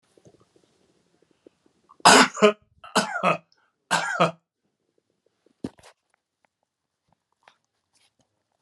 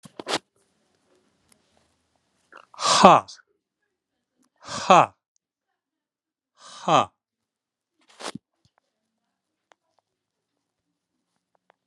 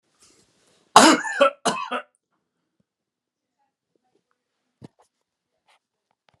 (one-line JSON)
{"three_cough_length": "8.6 s", "three_cough_amplitude": 32109, "three_cough_signal_mean_std_ratio": 0.24, "exhalation_length": "11.9 s", "exhalation_amplitude": 32768, "exhalation_signal_mean_std_ratio": 0.19, "cough_length": "6.4 s", "cough_amplitude": 32768, "cough_signal_mean_std_ratio": 0.22, "survey_phase": "beta (2021-08-13 to 2022-03-07)", "age": "65+", "gender": "Male", "wearing_mask": "No", "symptom_none": true, "symptom_onset": "13 days", "smoker_status": "Never smoked", "respiratory_condition_asthma": false, "respiratory_condition_other": false, "recruitment_source": "REACT", "submission_delay": "4 days", "covid_test_result": "Negative", "covid_test_method": "RT-qPCR"}